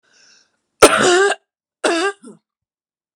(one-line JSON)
{"cough_length": "3.2 s", "cough_amplitude": 32768, "cough_signal_mean_std_ratio": 0.37, "survey_phase": "beta (2021-08-13 to 2022-03-07)", "age": "45-64", "gender": "Female", "wearing_mask": "No", "symptom_new_continuous_cough": true, "symptom_runny_or_blocked_nose": true, "symptom_shortness_of_breath": true, "symptom_sore_throat": true, "symptom_fatigue": true, "symptom_headache": true, "symptom_other": true, "smoker_status": "Never smoked", "respiratory_condition_asthma": true, "respiratory_condition_other": false, "recruitment_source": "Test and Trace", "submission_delay": "2 days", "covid_test_result": "Positive", "covid_test_method": "LFT"}